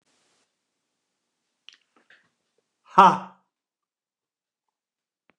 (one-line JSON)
{"exhalation_length": "5.4 s", "exhalation_amplitude": 29204, "exhalation_signal_mean_std_ratio": 0.14, "survey_phase": "beta (2021-08-13 to 2022-03-07)", "age": "65+", "gender": "Male", "wearing_mask": "No", "symptom_none": true, "smoker_status": "Never smoked", "respiratory_condition_asthma": false, "respiratory_condition_other": false, "recruitment_source": "REACT", "submission_delay": "-1 day", "covid_test_result": "Negative", "covid_test_method": "RT-qPCR", "influenza_a_test_result": "Negative", "influenza_b_test_result": "Negative"}